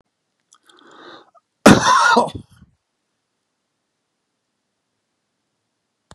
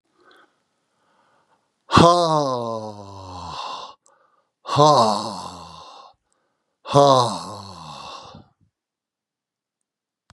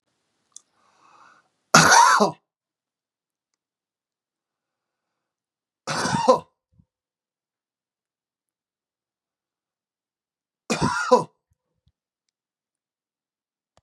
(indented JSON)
{
  "cough_length": "6.1 s",
  "cough_amplitude": 32768,
  "cough_signal_mean_std_ratio": 0.24,
  "exhalation_length": "10.3 s",
  "exhalation_amplitude": 32767,
  "exhalation_signal_mean_std_ratio": 0.35,
  "three_cough_length": "13.8 s",
  "three_cough_amplitude": 32767,
  "three_cough_signal_mean_std_ratio": 0.23,
  "survey_phase": "beta (2021-08-13 to 2022-03-07)",
  "age": "65+",
  "gender": "Male",
  "wearing_mask": "No",
  "symptom_none": true,
  "symptom_onset": "12 days",
  "smoker_status": "Never smoked",
  "respiratory_condition_asthma": false,
  "respiratory_condition_other": false,
  "recruitment_source": "REACT",
  "submission_delay": "6 days",
  "covid_test_result": "Positive",
  "covid_test_method": "RT-qPCR",
  "covid_ct_value": 25.0,
  "covid_ct_gene": "E gene",
  "influenza_a_test_result": "Negative",
  "influenza_b_test_result": "Negative"
}